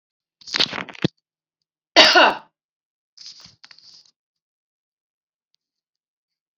{"cough_length": "6.6 s", "cough_amplitude": 31546, "cough_signal_mean_std_ratio": 0.22, "survey_phase": "beta (2021-08-13 to 2022-03-07)", "age": "45-64", "gender": "Female", "wearing_mask": "No", "symptom_none": true, "smoker_status": "Ex-smoker", "respiratory_condition_asthma": true, "respiratory_condition_other": false, "recruitment_source": "Test and Trace", "submission_delay": "-2 days", "covid_test_result": "Negative", "covid_test_method": "RT-qPCR"}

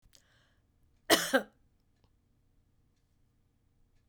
{"cough_length": "4.1 s", "cough_amplitude": 12262, "cough_signal_mean_std_ratio": 0.2, "survey_phase": "beta (2021-08-13 to 2022-03-07)", "age": "65+", "gender": "Female", "wearing_mask": "No", "symptom_none": true, "smoker_status": "Never smoked", "respiratory_condition_asthma": false, "respiratory_condition_other": false, "recruitment_source": "REACT", "submission_delay": "4 days", "covid_test_result": "Negative", "covid_test_method": "RT-qPCR", "influenza_a_test_result": "Negative", "influenza_b_test_result": "Negative"}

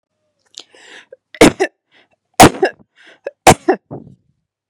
{"three_cough_length": "4.7 s", "three_cough_amplitude": 32768, "three_cough_signal_mean_std_ratio": 0.27, "survey_phase": "beta (2021-08-13 to 2022-03-07)", "age": "18-44", "gender": "Female", "wearing_mask": "No", "symptom_headache": true, "smoker_status": "Never smoked", "respiratory_condition_asthma": false, "respiratory_condition_other": false, "recruitment_source": "REACT", "submission_delay": "4 days", "covid_test_result": "Negative", "covid_test_method": "RT-qPCR", "influenza_a_test_result": "Negative", "influenza_b_test_result": "Negative"}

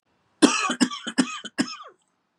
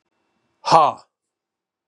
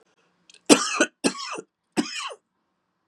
{"cough_length": "2.4 s", "cough_amplitude": 29076, "cough_signal_mean_std_ratio": 0.4, "exhalation_length": "1.9 s", "exhalation_amplitude": 32768, "exhalation_signal_mean_std_ratio": 0.27, "three_cough_length": "3.1 s", "three_cough_amplitude": 32768, "three_cough_signal_mean_std_ratio": 0.32, "survey_phase": "beta (2021-08-13 to 2022-03-07)", "age": "45-64", "gender": "Male", "wearing_mask": "No", "symptom_new_continuous_cough": true, "symptom_runny_or_blocked_nose": true, "symptom_fatigue": true, "symptom_fever_high_temperature": true, "symptom_headache": true, "symptom_change_to_sense_of_smell_or_taste": true, "symptom_loss_of_taste": true, "symptom_onset": "3 days", "smoker_status": "Ex-smoker", "respiratory_condition_asthma": false, "respiratory_condition_other": false, "recruitment_source": "Test and Trace", "submission_delay": "1 day", "covid_test_result": "Positive", "covid_test_method": "RT-qPCR", "covid_ct_value": 19.4, "covid_ct_gene": "ORF1ab gene", "covid_ct_mean": 20.4, "covid_viral_load": "200000 copies/ml", "covid_viral_load_category": "Low viral load (10K-1M copies/ml)"}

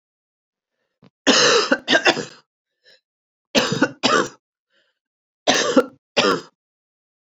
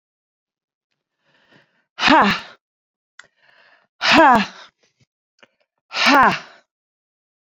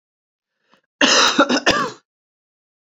{"three_cough_length": "7.3 s", "three_cough_amplitude": 30694, "three_cough_signal_mean_std_ratio": 0.4, "exhalation_length": "7.5 s", "exhalation_amplitude": 29398, "exhalation_signal_mean_std_ratio": 0.31, "cough_length": "2.8 s", "cough_amplitude": 32768, "cough_signal_mean_std_ratio": 0.42, "survey_phase": "beta (2021-08-13 to 2022-03-07)", "age": "45-64", "gender": "Female", "wearing_mask": "No", "symptom_none": true, "smoker_status": "Ex-smoker", "respiratory_condition_asthma": false, "respiratory_condition_other": false, "recruitment_source": "REACT", "submission_delay": "3 days", "covid_test_result": "Negative", "covid_test_method": "RT-qPCR"}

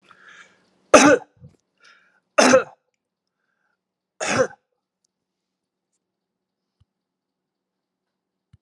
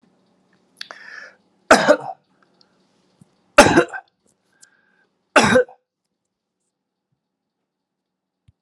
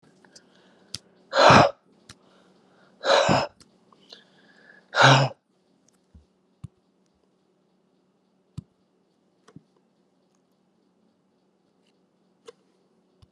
{"three_cough_length": "8.6 s", "three_cough_amplitude": 32768, "three_cough_signal_mean_std_ratio": 0.22, "cough_length": "8.6 s", "cough_amplitude": 32768, "cough_signal_mean_std_ratio": 0.24, "exhalation_length": "13.3 s", "exhalation_amplitude": 29478, "exhalation_signal_mean_std_ratio": 0.23, "survey_phase": "alpha (2021-03-01 to 2021-08-12)", "age": "65+", "gender": "Male", "wearing_mask": "No", "symptom_none": true, "smoker_status": "Never smoked", "respiratory_condition_asthma": false, "respiratory_condition_other": false, "recruitment_source": "REACT", "submission_delay": "5 days", "covid_test_result": "Negative", "covid_test_method": "RT-qPCR"}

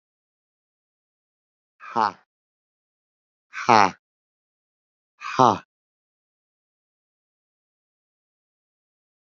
{"exhalation_length": "9.4 s", "exhalation_amplitude": 28717, "exhalation_signal_mean_std_ratio": 0.16, "survey_phase": "alpha (2021-03-01 to 2021-08-12)", "age": "45-64", "gender": "Male", "wearing_mask": "No", "symptom_cough_any": true, "symptom_onset": "5 days", "smoker_status": "Current smoker (1 to 10 cigarettes per day)", "respiratory_condition_asthma": true, "respiratory_condition_other": true, "recruitment_source": "Test and Trace", "submission_delay": "2 days", "covid_test_result": "Positive", "covid_test_method": "RT-qPCR"}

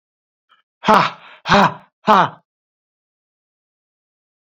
{"exhalation_length": "4.4 s", "exhalation_amplitude": 27716, "exhalation_signal_mean_std_ratio": 0.3, "survey_phase": "beta (2021-08-13 to 2022-03-07)", "age": "45-64", "gender": "Male", "wearing_mask": "No", "symptom_none": true, "smoker_status": "Current smoker (11 or more cigarettes per day)", "respiratory_condition_asthma": false, "respiratory_condition_other": false, "recruitment_source": "REACT", "submission_delay": "1 day", "covid_test_result": "Negative", "covid_test_method": "RT-qPCR"}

